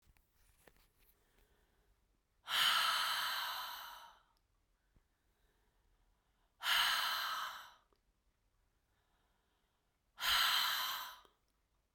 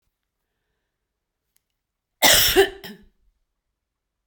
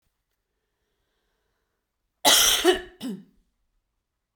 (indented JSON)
{
  "exhalation_length": "11.9 s",
  "exhalation_amplitude": 3077,
  "exhalation_signal_mean_std_ratio": 0.42,
  "cough_length": "4.3 s",
  "cough_amplitude": 28150,
  "cough_signal_mean_std_ratio": 0.26,
  "three_cough_length": "4.4 s",
  "three_cough_amplitude": 21918,
  "three_cough_signal_mean_std_ratio": 0.3,
  "survey_phase": "beta (2021-08-13 to 2022-03-07)",
  "age": "65+",
  "gender": "Female",
  "wearing_mask": "No",
  "symptom_none": true,
  "symptom_onset": "8 days",
  "smoker_status": "Never smoked",
  "respiratory_condition_asthma": true,
  "respiratory_condition_other": false,
  "recruitment_source": "REACT",
  "submission_delay": "7 days",
  "covid_test_result": "Negative",
  "covid_test_method": "RT-qPCR"
}